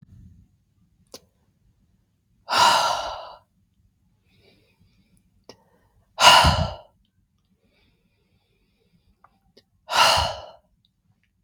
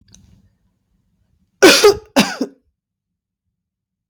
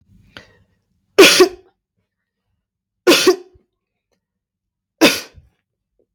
{"exhalation_length": "11.4 s", "exhalation_amplitude": 32768, "exhalation_signal_mean_std_ratio": 0.28, "cough_length": "4.1 s", "cough_amplitude": 32768, "cough_signal_mean_std_ratio": 0.28, "three_cough_length": "6.1 s", "three_cough_amplitude": 32768, "three_cough_signal_mean_std_ratio": 0.28, "survey_phase": "beta (2021-08-13 to 2022-03-07)", "age": "45-64", "gender": "Female", "wearing_mask": "No", "symptom_none": true, "smoker_status": "Never smoked", "respiratory_condition_asthma": false, "respiratory_condition_other": false, "recruitment_source": "REACT", "submission_delay": "2 days", "covid_test_result": "Negative", "covid_test_method": "RT-qPCR"}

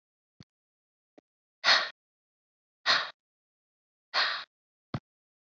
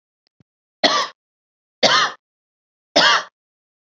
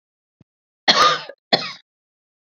{"exhalation_length": "5.5 s", "exhalation_amplitude": 10859, "exhalation_signal_mean_std_ratio": 0.27, "three_cough_length": "3.9 s", "three_cough_amplitude": 30864, "three_cough_signal_mean_std_ratio": 0.35, "cough_length": "2.5 s", "cough_amplitude": 31031, "cough_signal_mean_std_ratio": 0.32, "survey_phase": "beta (2021-08-13 to 2022-03-07)", "age": "45-64", "gender": "Female", "wearing_mask": "No", "symptom_none": true, "smoker_status": "Ex-smoker", "respiratory_condition_asthma": false, "respiratory_condition_other": false, "recruitment_source": "REACT", "submission_delay": "1 day", "covid_test_result": "Negative", "covid_test_method": "RT-qPCR", "influenza_a_test_result": "Negative", "influenza_b_test_result": "Negative"}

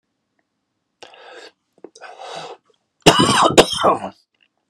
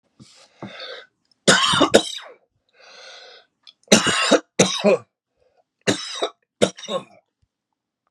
{"cough_length": "4.7 s", "cough_amplitude": 32768, "cough_signal_mean_std_ratio": 0.34, "three_cough_length": "8.1 s", "three_cough_amplitude": 32768, "three_cough_signal_mean_std_ratio": 0.36, "survey_phase": "beta (2021-08-13 to 2022-03-07)", "age": "45-64", "gender": "Male", "wearing_mask": "No", "symptom_none": true, "smoker_status": "Never smoked", "respiratory_condition_asthma": true, "respiratory_condition_other": false, "recruitment_source": "REACT", "submission_delay": "1 day", "covid_test_result": "Negative", "covid_test_method": "RT-qPCR", "influenza_a_test_result": "Unknown/Void", "influenza_b_test_result": "Unknown/Void"}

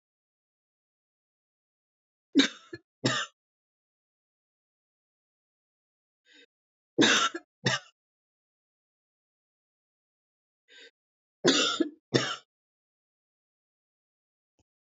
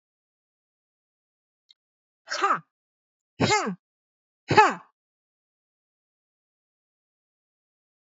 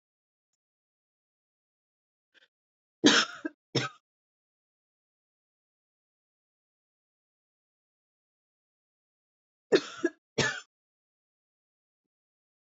{"three_cough_length": "14.9 s", "three_cough_amplitude": 12730, "three_cough_signal_mean_std_ratio": 0.23, "exhalation_length": "8.0 s", "exhalation_amplitude": 27497, "exhalation_signal_mean_std_ratio": 0.22, "cough_length": "12.7 s", "cough_amplitude": 17456, "cough_signal_mean_std_ratio": 0.17, "survey_phase": "beta (2021-08-13 to 2022-03-07)", "age": "18-44", "gender": "Female", "wearing_mask": "No", "symptom_new_continuous_cough": true, "symptom_onset": "12 days", "smoker_status": "Never smoked", "respiratory_condition_asthma": false, "respiratory_condition_other": false, "recruitment_source": "REACT", "submission_delay": "3 days", "covid_test_result": "Negative", "covid_test_method": "RT-qPCR", "influenza_a_test_result": "Negative", "influenza_b_test_result": "Negative"}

